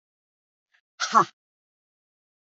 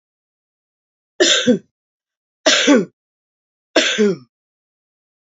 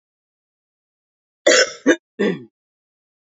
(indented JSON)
{
  "exhalation_length": "2.5 s",
  "exhalation_amplitude": 23735,
  "exhalation_signal_mean_std_ratio": 0.19,
  "three_cough_length": "5.3 s",
  "three_cough_amplitude": 31667,
  "three_cough_signal_mean_std_ratio": 0.37,
  "cough_length": "3.2 s",
  "cough_amplitude": 28312,
  "cough_signal_mean_std_ratio": 0.3,
  "survey_phase": "alpha (2021-03-01 to 2021-08-12)",
  "age": "45-64",
  "gender": "Female",
  "wearing_mask": "No",
  "symptom_cough_any": true,
  "symptom_fatigue": true,
  "symptom_headache": true,
  "symptom_change_to_sense_of_smell_or_taste": true,
  "symptom_loss_of_taste": true,
  "symptom_onset": "4 days",
  "smoker_status": "Never smoked",
  "respiratory_condition_asthma": false,
  "respiratory_condition_other": false,
  "recruitment_source": "Test and Trace",
  "submission_delay": "1 day",
  "covid_test_result": "Positive",
  "covid_test_method": "RT-qPCR",
  "covid_ct_value": 14.2,
  "covid_ct_gene": "ORF1ab gene",
  "covid_ct_mean": 14.6,
  "covid_viral_load": "16000000 copies/ml",
  "covid_viral_load_category": "High viral load (>1M copies/ml)"
}